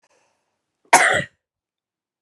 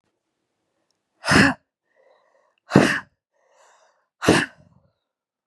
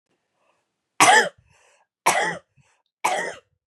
cough_length: 2.2 s
cough_amplitude: 32768
cough_signal_mean_std_ratio: 0.27
exhalation_length: 5.5 s
exhalation_amplitude: 32768
exhalation_signal_mean_std_ratio: 0.27
three_cough_length: 3.7 s
three_cough_amplitude: 31633
three_cough_signal_mean_std_ratio: 0.34
survey_phase: beta (2021-08-13 to 2022-03-07)
age: 18-44
gender: Female
wearing_mask: 'No'
symptom_cough_any: true
symptom_runny_or_blocked_nose: true
symptom_fatigue: true
symptom_other: true
symptom_onset: 3 days
smoker_status: Never smoked
respiratory_condition_asthma: false
respiratory_condition_other: true
recruitment_source: Test and Trace
submission_delay: 2 days
covid_test_result: Positive
covid_test_method: RT-qPCR
covid_ct_value: 20.0
covid_ct_gene: ORF1ab gene
covid_ct_mean: 20.7
covid_viral_load: 160000 copies/ml
covid_viral_load_category: Low viral load (10K-1M copies/ml)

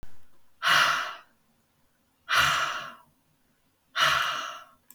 exhalation_length: 4.9 s
exhalation_amplitude: 12259
exhalation_signal_mean_std_ratio: 0.5
survey_phase: beta (2021-08-13 to 2022-03-07)
age: 45-64
gender: Female
wearing_mask: 'No'
symptom_cough_any: true
symptom_fatigue: true
symptom_onset: 12 days
smoker_status: Current smoker (e-cigarettes or vapes only)
respiratory_condition_asthma: false
respiratory_condition_other: false
recruitment_source: REACT
submission_delay: 3 days
covid_test_result: Negative
covid_test_method: RT-qPCR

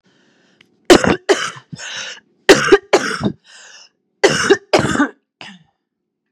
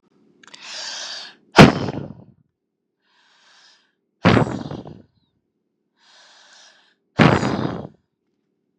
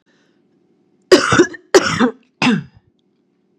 three_cough_length: 6.3 s
three_cough_amplitude: 32768
three_cough_signal_mean_std_ratio: 0.38
exhalation_length: 8.8 s
exhalation_amplitude: 32768
exhalation_signal_mean_std_ratio: 0.27
cough_length: 3.6 s
cough_amplitude: 32768
cough_signal_mean_std_ratio: 0.38
survey_phase: beta (2021-08-13 to 2022-03-07)
age: 18-44
gender: Female
wearing_mask: 'No'
symptom_cough_any: true
symptom_shortness_of_breath: true
symptom_fatigue: true
symptom_fever_high_temperature: true
symptom_headache: true
symptom_other: true
symptom_onset: 3 days
smoker_status: Never smoked
respiratory_condition_asthma: false
respiratory_condition_other: false
recruitment_source: Test and Trace
submission_delay: 2 days
covid_test_result: Positive
covid_test_method: RT-qPCR
covid_ct_value: 21.8
covid_ct_gene: ORF1ab gene
covid_ct_mean: 22.4
covid_viral_load: 44000 copies/ml
covid_viral_load_category: Low viral load (10K-1M copies/ml)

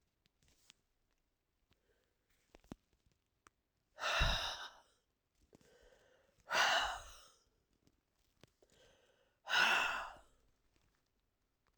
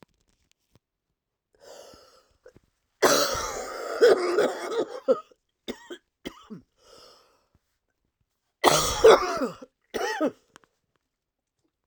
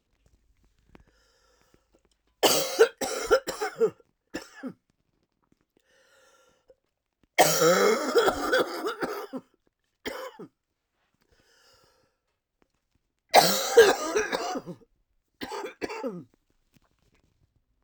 exhalation_length: 11.8 s
exhalation_amplitude: 3356
exhalation_signal_mean_std_ratio: 0.31
cough_length: 11.9 s
cough_amplitude: 27958
cough_signal_mean_std_ratio: 0.34
three_cough_length: 17.8 s
three_cough_amplitude: 26737
three_cough_signal_mean_std_ratio: 0.35
survey_phase: alpha (2021-03-01 to 2021-08-12)
age: 45-64
gender: Female
wearing_mask: 'No'
symptom_cough_any: true
symptom_shortness_of_breath: true
symptom_fatigue: true
symptom_change_to_sense_of_smell_or_taste: true
symptom_loss_of_taste: true
smoker_status: Never smoked
respiratory_condition_asthma: true
respiratory_condition_other: false
recruitment_source: Test and Trace
submission_delay: 1 day
covid_test_result: Positive
covid_test_method: LFT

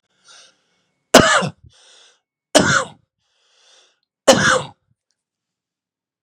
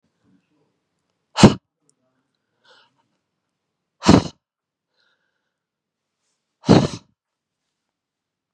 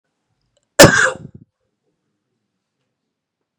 three_cough_length: 6.2 s
three_cough_amplitude: 32768
three_cough_signal_mean_std_ratio: 0.29
exhalation_length: 8.5 s
exhalation_amplitude: 32768
exhalation_signal_mean_std_ratio: 0.18
cough_length: 3.6 s
cough_amplitude: 32768
cough_signal_mean_std_ratio: 0.22
survey_phase: beta (2021-08-13 to 2022-03-07)
age: 45-64
gender: Male
wearing_mask: 'No'
symptom_cough_any: true
symptom_runny_or_blocked_nose: true
symptom_sore_throat: true
symptom_fatigue: true
smoker_status: Ex-smoker
respiratory_condition_asthma: true
respiratory_condition_other: false
recruitment_source: Test and Trace
submission_delay: 1 day
covid_test_result: Positive
covid_test_method: RT-qPCR
covid_ct_value: 16.3
covid_ct_gene: ORF1ab gene
covid_ct_mean: 16.6
covid_viral_load: 3600000 copies/ml
covid_viral_load_category: High viral load (>1M copies/ml)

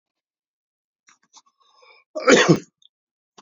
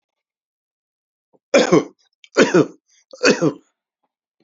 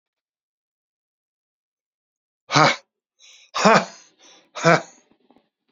cough_length: 3.4 s
cough_amplitude: 29210
cough_signal_mean_std_ratio: 0.24
three_cough_length: 4.4 s
three_cough_amplitude: 30700
three_cough_signal_mean_std_ratio: 0.32
exhalation_length: 5.7 s
exhalation_amplitude: 30212
exhalation_signal_mean_std_ratio: 0.26
survey_phase: beta (2021-08-13 to 2022-03-07)
age: 65+
gender: Male
wearing_mask: 'No'
symptom_runny_or_blocked_nose: true
symptom_onset: 13 days
smoker_status: Ex-smoker
respiratory_condition_asthma: false
respiratory_condition_other: false
recruitment_source: REACT
submission_delay: 2 days
covid_test_result: Negative
covid_test_method: RT-qPCR
influenza_a_test_result: Negative
influenza_b_test_result: Negative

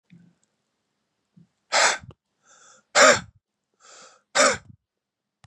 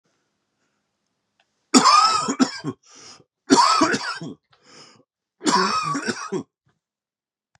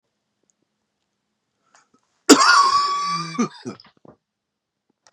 exhalation_length: 5.5 s
exhalation_amplitude: 27401
exhalation_signal_mean_std_ratio: 0.28
three_cough_length: 7.6 s
three_cough_amplitude: 32753
three_cough_signal_mean_std_ratio: 0.42
cough_length: 5.1 s
cough_amplitude: 32768
cough_signal_mean_std_ratio: 0.34
survey_phase: beta (2021-08-13 to 2022-03-07)
age: 45-64
gender: Male
wearing_mask: 'No'
symptom_cough_any: true
symptom_runny_or_blocked_nose: true
symptom_shortness_of_breath: true
symptom_sore_throat: true
symptom_fatigue: true
symptom_headache: true
symptom_other: true
symptom_onset: 2 days
smoker_status: Never smoked
respiratory_condition_asthma: false
respiratory_condition_other: false
recruitment_source: Test and Trace
submission_delay: 1 day
covid_test_result: Positive
covid_test_method: ePCR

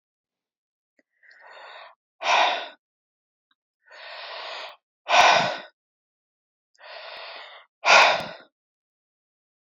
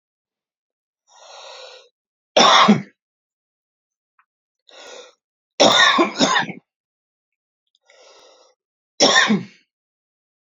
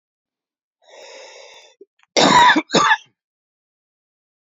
exhalation_length: 9.7 s
exhalation_amplitude: 27421
exhalation_signal_mean_std_ratio: 0.31
three_cough_length: 10.4 s
three_cough_amplitude: 32767
three_cough_signal_mean_std_ratio: 0.32
cough_length: 4.5 s
cough_amplitude: 28670
cough_signal_mean_std_ratio: 0.33
survey_phase: beta (2021-08-13 to 2022-03-07)
age: 18-44
gender: Male
wearing_mask: 'No'
symptom_cough_any: true
symptom_onset: 11 days
smoker_status: Prefer not to say
respiratory_condition_asthma: false
respiratory_condition_other: false
recruitment_source: REACT
submission_delay: 2 days
covid_test_result: Negative
covid_test_method: RT-qPCR
influenza_a_test_result: Negative
influenza_b_test_result: Negative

